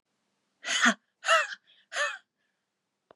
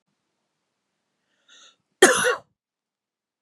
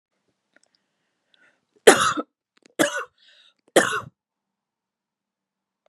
{
  "exhalation_length": "3.2 s",
  "exhalation_amplitude": 11374,
  "exhalation_signal_mean_std_ratio": 0.36,
  "cough_length": "3.4 s",
  "cough_amplitude": 32253,
  "cough_signal_mean_std_ratio": 0.22,
  "three_cough_length": "5.9 s",
  "three_cough_amplitude": 32768,
  "three_cough_signal_mean_std_ratio": 0.23,
  "survey_phase": "beta (2021-08-13 to 2022-03-07)",
  "age": "18-44",
  "gender": "Female",
  "wearing_mask": "No",
  "symptom_none": true,
  "smoker_status": "Never smoked",
  "respiratory_condition_asthma": false,
  "respiratory_condition_other": false,
  "recruitment_source": "REACT",
  "submission_delay": "1 day",
  "covid_test_result": "Negative",
  "covid_test_method": "RT-qPCR"
}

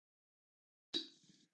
{
  "cough_length": "1.5 s",
  "cough_amplitude": 1567,
  "cough_signal_mean_std_ratio": 0.22,
  "survey_phase": "beta (2021-08-13 to 2022-03-07)",
  "age": "45-64",
  "gender": "Male",
  "wearing_mask": "No",
  "symptom_runny_or_blocked_nose": true,
  "smoker_status": "Never smoked",
  "respiratory_condition_asthma": false,
  "respiratory_condition_other": false,
  "recruitment_source": "REACT",
  "submission_delay": "1 day",
  "covid_test_result": "Negative",
  "covid_test_method": "RT-qPCR",
  "influenza_a_test_result": "Negative",
  "influenza_b_test_result": "Negative"
}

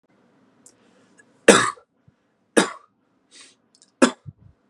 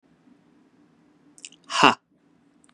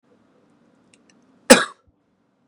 {
  "three_cough_length": "4.7 s",
  "three_cough_amplitude": 32768,
  "three_cough_signal_mean_std_ratio": 0.21,
  "exhalation_length": "2.7 s",
  "exhalation_amplitude": 32767,
  "exhalation_signal_mean_std_ratio": 0.2,
  "cough_length": "2.5 s",
  "cough_amplitude": 32768,
  "cough_signal_mean_std_ratio": 0.17,
  "survey_phase": "beta (2021-08-13 to 2022-03-07)",
  "age": "18-44",
  "gender": "Male",
  "wearing_mask": "No",
  "symptom_cough_any": true,
  "symptom_fatigue": true,
  "symptom_fever_high_temperature": true,
  "symptom_headache": true,
  "symptom_change_to_sense_of_smell_or_taste": true,
  "symptom_loss_of_taste": true,
  "symptom_onset": "3 days",
  "smoker_status": "Never smoked",
  "respiratory_condition_asthma": true,
  "respiratory_condition_other": false,
  "recruitment_source": "Test and Trace",
  "submission_delay": "1 day",
  "covid_test_result": "Positive",
  "covid_test_method": "RT-qPCR",
  "covid_ct_value": 22.5,
  "covid_ct_gene": "N gene"
}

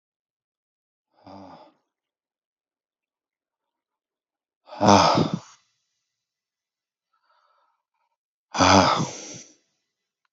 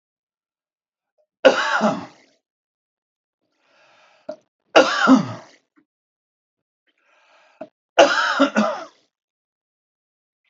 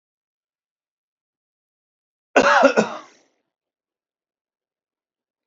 {
  "exhalation_length": "10.3 s",
  "exhalation_amplitude": 30991,
  "exhalation_signal_mean_std_ratio": 0.25,
  "three_cough_length": "10.5 s",
  "three_cough_amplitude": 30606,
  "three_cough_signal_mean_std_ratio": 0.3,
  "cough_length": "5.5 s",
  "cough_amplitude": 28804,
  "cough_signal_mean_std_ratio": 0.23,
  "survey_phase": "alpha (2021-03-01 to 2021-08-12)",
  "age": "45-64",
  "gender": "Male",
  "wearing_mask": "No",
  "symptom_shortness_of_breath": true,
  "symptom_headache": true,
  "symptom_onset": "12 days",
  "smoker_status": "Never smoked",
  "respiratory_condition_asthma": false,
  "respiratory_condition_other": false,
  "recruitment_source": "REACT",
  "submission_delay": "2 days",
  "covid_test_result": "Negative",
  "covid_test_method": "RT-qPCR"
}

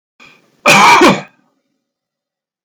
{
  "cough_length": "2.6 s",
  "cough_amplitude": 32768,
  "cough_signal_mean_std_ratio": 0.41,
  "survey_phase": "alpha (2021-03-01 to 2021-08-12)",
  "age": "65+",
  "gender": "Male",
  "wearing_mask": "No",
  "symptom_none": true,
  "smoker_status": "Never smoked",
  "respiratory_condition_asthma": false,
  "respiratory_condition_other": false,
  "recruitment_source": "REACT",
  "submission_delay": "1 day",
  "covid_test_result": "Negative",
  "covid_test_method": "RT-qPCR"
}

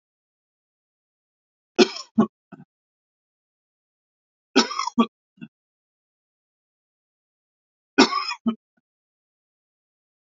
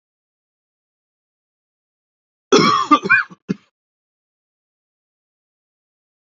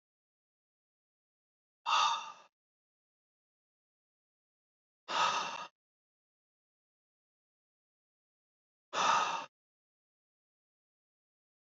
{
  "three_cough_length": "10.2 s",
  "three_cough_amplitude": 28019,
  "three_cough_signal_mean_std_ratio": 0.2,
  "cough_length": "6.4 s",
  "cough_amplitude": 29697,
  "cough_signal_mean_std_ratio": 0.24,
  "exhalation_length": "11.7 s",
  "exhalation_amplitude": 4529,
  "exhalation_signal_mean_std_ratio": 0.26,
  "survey_phase": "beta (2021-08-13 to 2022-03-07)",
  "age": "45-64",
  "gender": "Male",
  "wearing_mask": "No",
  "symptom_cough_any": true,
  "smoker_status": "Never smoked",
  "respiratory_condition_asthma": false,
  "respiratory_condition_other": false,
  "recruitment_source": "REACT",
  "submission_delay": "2 days",
  "covid_test_result": "Negative",
  "covid_test_method": "RT-qPCR",
  "influenza_a_test_result": "Negative",
  "influenza_b_test_result": "Negative"
}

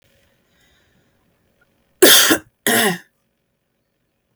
{
  "cough_length": "4.4 s",
  "cough_amplitude": 32768,
  "cough_signal_mean_std_ratio": 0.3,
  "survey_phase": "beta (2021-08-13 to 2022-03-07)",
  "age": "18-44",
  "gender": "Female",
  "wearing_mask": "No",
  "symptom_cough_any": true,
  "symptom_runny_or_blocked_nose": true,
  "symptom_onset": "13 days",
  "smoker_status": "Ex-smoker",
  "respiratory_condition_asthma": false,
  "respiratory_condition_other": false,
  "recruitment_source": "REACT",
  "submission_delay": "2 days",
  "covid_test_result": "Negative",
  "covid_test_method": "RT-qPCR",
  "influenza_a_test_result": "Negative",
  "influenza_b_test_result": "Negative"
}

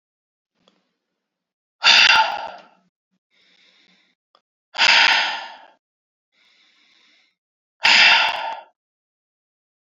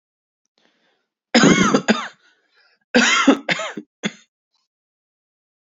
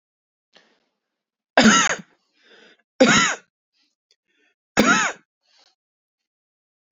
{
  "exhalation_length": "10.0 s",
  "exhalation_amplitude": 31366,
  "exhalation_signal_mean_std_ratio": 0.33,
  "cough_length": "5.7 s",
  "cough_amplitude": 29225,
  "cough_signal_mean_std_ratio": 0.36,
  "three_cough_length": "6.9 s",
  "three_cough_amplitude": 30640,
  "three_cough_signal_mean_std_ratio": 0.31,
  "survey_phase": "beta (2021-08-13 to 2022-03-07)",
  "age": "18-44",
  "gender": "Male",
  "wearing_mask": "No",
  "symptom_cough_any": true,
  "symptom_new_continuous_cough": true,
  "symptom_runny_or_blocked_nose": true,
  "symptom_sore_throat": true,
  "symptom_fatigue": true,
  "symptom_onset": "3 days",
  "smoker_status": "Never smoked",
  "respiratory_condition_asthma": false,
  "respiratory_condition_other": false,
  "recruitment_source": "Test and Trace",
  "submission_delay": "2 days",
  "covid_test_result": "Positive",
  "covid_test_method": "RT-qPCR",
  "covid_ct_value": 21.4,
  "covid_ct_gene": "ORF1ab gene",
  "covid_ct_mean": 21.9,
  "covid_viral_load": "65000 copies/ml",
  "covid_viral_load_category": "Low viral load (10K-1M copies/ml)"
}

